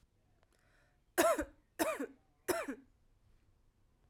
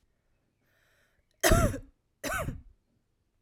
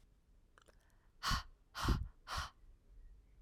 {"three_cough_length": "4.1 s", "three_cough_amplitude": 6472, "three_cough_signal_mean_std_ratio": 0.33, "cough_length": "3.4 s", "cough_amplitude": 12456, "cough_signal_mean_std_ratio": 0.32, "exhalation_length": "3.4 s", "exhalation_amplitude": 3191, "exhalation_signal_mean_std_ratio": 0.4, "survey_phase": "alpha (2021-03-01 to 2021-08-12)", "age": "18-44", "gender": "Female", "wearing_mask": "No", "symptom_headache": true, "symptom_change_to_sense_of_smell_or_taste": true, "symptom_onset": "2 days", "smoker_status": "Never smoked", "respiratory_condition_asthma": false, "respiratory_condition_other": false, "recruitment_source": "Test and Trace", "submission_delay": "1 day", "covid_test_result": "Positive", "covid_test_method": "RT-qPCR", "covid_ct_value": 15.9, "covid_ct_gene": "ORF1ab gene", "covid_ct_mean": 17.0, "covid_viral_load": "2700000 copies/ml", "covid_viral_load_category": "High viral load (>1M copies/ml)"}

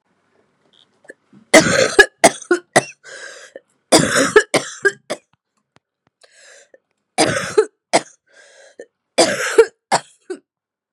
{"three_cough_length": "10.9 s", "three_cough_amplitude": 32768, "three_cough_signal_mean_std_ratio": 0.34, "survey_phase": "beta (2021-08-13 to 2022-03-07)", "age": "18-44", "gender": "Female", "wearing_mask": "No", "symptom_cough_any": true, "symptom_runny_or_blocked_nose": true, "symptom_fatigue": true, "symptom_headache": true, "symptom_change_to_sense_of_smell_or_taste": true, "smoker_status": "Ex-smoker", "respiratory_condition_asthma": false, "respiratory_condition_other": false, "recruitment_source": "Test and Trace", "submission_delay": "2 days", "covid_test_result": "Positive", "covid_test_method": "RT-qPCR", "covid_ct_value": 20.8, "covid_ct_gene": "ORF1ab gene", "covid_ct_mean": 21.0, "covid_viral_load": "130000 copies/ml", "covid_viral_load_category": "Low viral load (10K-1M copies/ml)"}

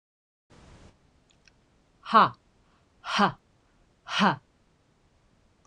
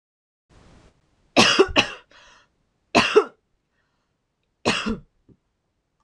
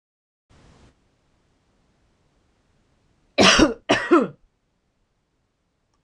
{"exhalation_length": "5.7 s", "exhalation_amplitude": 19703, "exhalation_signal_mean_std_ratio": 0.26, "three_cough_length": "6.0 s", "three_cough_amplitude": 26028, "three_cough_signal_mean_std_ratio": 0.29, "cough_length": "6.0 s", "cough_amplitude": 25309, "cough_signal_mean_std_ratio": 0.25, "survey_phase": "beta (2021-08-13 to 2022-03-07)", "age": "18-44", "gender": "Female", "wearing_mask": "No", "symptom_none": true, "smoker_status": "Ex-smoker", "respiratory_condition_asthma": false, "respiratory_condition_other": false, "recruitment_source": "REACT", "submission_delay": "1 day", "covid_test_result": "Negative", "covid_test_method": "RT-qPCR"}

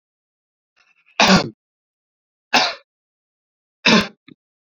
{"three_cough_length": "4.8 s", "three_cough_amplitude": 30437, "three_cough_signal_mean_std_ratio": 0.28, "survey_phase": "beta (2021-08-13 to 2022-03-07)", "age": "18-44", "gender": "Male", "wearing_mask": "No", "symptom_fatigue": true, "smoker_status": "Never smoked", "respiratory_condition_asthma": false, "respiratory_condition_other": false, "recruitment_source": "Test and Trace", "submission_delay": "12 days", "covid_test_result": "Negative", "covid_test_method": "RT-qPCR"}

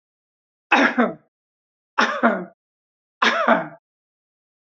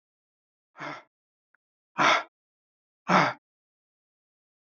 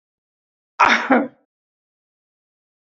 {"three_cough_length": "4.8 s", "three_cough_amplitude": 28434, "three_cough_signal_mean_std_ratio": 0.38, "exhalation_length": "4.7 s", "exhalation_amplitude": 14870, "exhalation_signal_mean_std_ratio": 0.26, "cough_length": "2.8 s", "cough_amplitude": 27469, "cough_signal_mean_std_ratio": 0.29, "survey_phase": "beta (2021-08-13 to 2022-03-07)", "age": "65+", "gender": "Male", "wearing_mask": "No", "symptom_none": true, "smoker_status": "Ex-smoker", "respiratory_condition_asthma": false, "respiratory_condition_other": false, "recruitment_source": "REACT", "submission_delay": "2 days", "covid_test_result": "Negative", "covid_test_method": "RT-qPCR", "influenza_a_test_result": "Negative", "influenza_b_test_result": "Negative"}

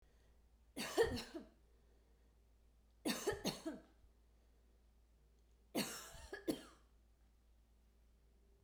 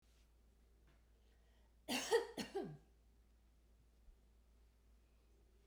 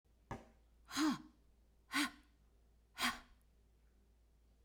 {"three_cough_length": "8.6 s", "three_cough_amplitude": 2554, "three_cough_signal_mean_std_ratio": 0.36, "cough_length": "5.7 s", "cough_amplitude": 2116, "cough_signal_mean_std_ratio": 0.31, "exhalation_length": "4.6 s", "exhalation_amplitude": 2008, "exhalation_signal_mean_std_ratio": 0.35, "survey_phase": "beta (2021-08-13 to 2022-03-07)", "age": "45-64", "gender": "Female", "wearing_mask": "No", "symptom_headache": true, "symptom_other": true, "symptom_onset": "12 days", "smoker_status": "Never smoked", "respiratory_condition_asthma": false, "respiratory_condition_other": false, "recruitment_source": "REACT", "submission_delay": "1 day", "covid_test_result": "Negative", "covid_test_method": "RT-qPCR"}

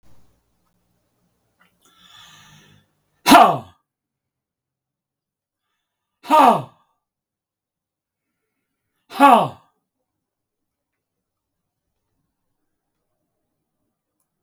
{"exhalation_length": "14.4 s", "exhalation_amplitude": 32768, "exhalation_signal_mean_std_ratio": 0.2, "survey_phase": "beta (2021-08-13 to 2022-03-07)", "age": "65+", "gender": "Male", "wearing_mask": "No", "symptom_none": true, "smoker_status": "Ex-smoker", "respiratory_condition_asthma": false, "respiratory_condition_other": false, "recruitment_source": "REACT", "submission_delay": "10 days", "covid_test_result": "Negative", "covid_test_method": "RT-qPCR"}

